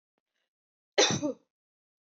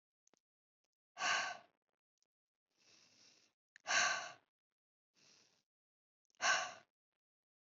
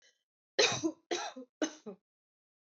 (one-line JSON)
{"cough_length": "2.1 s", "cough_amplitude": 10720, "cough_signal_mean_std_ratio": 0.29, "exhalation_length": "7.7 s", "exhalation_amplitude": 2725, "exhalation_signal_mean_std_ratio": 0.29, "three_cough_length": "2.6 s", "three_cough_amplitude": 7206, "three_cough_signal_mean_std_ratio": 0.36, "survey_phase": "beta (2021-08-13 to 2022-03-07)", "age": "18-44", "gender": "Female", "wearing_mask": "No", "symptom_none": true, "smoker_status": "Never smoked", "respiratory_condition_asthma": false, "respiratory_condition_other": false, "recruitment_source": "REACT", "submission_delay": "1 day", "covid_test_result": "Negative", "covid_test_method": "RT-qPCR"}